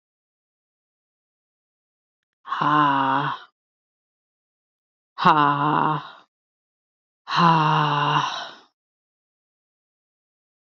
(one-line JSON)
{"exhalation_length": "10.8 s", "exhalation_amplitude": 27663, "exhalation_signal_mean_std_ratio": 0.4, "survey_phase": "beta (2021-08-13 to 2022-03-07)", "age": "18-44", "gender": "Female", "wearing_mask": "No", "symptom_cough_any": true, "symptom_sore_throat": true, "symptom_fatigue": true, "symptom_headache": true, "symptom_change_to_sense_of_smell_or_taste": true, "smoker_status": "Never smoked", "respiratory_condition_asthma": false, "respiratory_condition_other": false, "recruitment_source": "Test and Trace", "submission_delay": "2 days", "covid_test_result": "Positive", "covid_test_method": "RT-qPCR", "covid_ct_value": 31.3, "covid_ct_gene": "ORF1ab gene"}